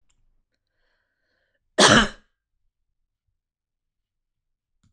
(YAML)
cough_length: 4.9 s
cough_amplitude: 25964
cough_signal_mean_std_ratio: 0.19
survey_phase: beta (2021-08-13 to 2022-03-07)
age: 18-44
gender: Female
wearing_mask: 'No'
symptom_none: true
smoker_status: Never smoked
respiratory_condition_asthma: false
respiratory_condition_other: false
recruitment_source: REACT
submission_delay: 5 days
covid_test_result: Negative
covid_test_method: RT-qPCR